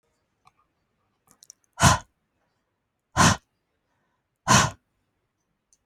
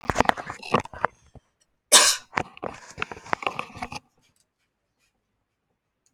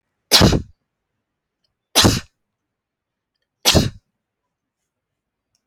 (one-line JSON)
{"exhalation_length": "5.9 s", "exhalation_amplitude": 21814, "exhalation_signal_mean_std_ratio": 0.24, "cough_length": "6.1 s", "cough_amplitude": 32768, "cough_signal_mean_std_ratio": 0.26, "three_cough_length": "5.7 s", "three_cough_amplitude": 32767, "three_cough_signal_mean_std_ratio": 0.28, "survey_phase": "alpha (2021-03-01 to 2021-08-12)", "age": "45-64", "gender": "Female", "wearing_mask": "No", "symptom_none": true, "smoker_status": "Never smoked", "respiratory_condition_asthma": false, "respiratory_condition_other": true, "recruitment_source": "REACT", "submission_delay": "3 days", "covid_test_result": "Negative", "covid_test_method": "RT-qPCR"}